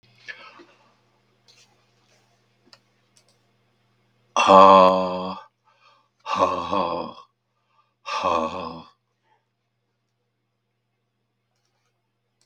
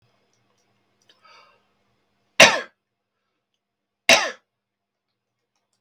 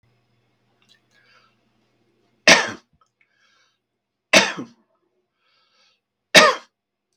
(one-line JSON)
{"exhalation_length": "12.5 s", "exhalation_amplitude": 32768, "exhalation_signal_mean_std_ratio": 0.27, "cough_length": "5.8 s", "cough_amplitude": 32768, "cough_signal_mean_std_ratio": 0.18, "three_cough_length": "7.2 s", "three_cough_amplitude": 32768, "three_cough_signal_mean_std_ratio": 0.21, "survey_phase": "beta (2021-08-13 to 2022-03-07)", "age": "65+", "gender": "Male", "wearing_mask": "No", "symptom_none": true, "smoker_status": "Ex-smoker", "respiratory_condition_asthma": false, "respiratory_condition_other": false, "recruitment_source": "REACT", "submission_delay": "2 days", "covid_test_result": "Negative", "covid_test_method": "RT-qPCR", "influenza_a_test_result": "Negative", "influenza_b_test_result": "Negative"}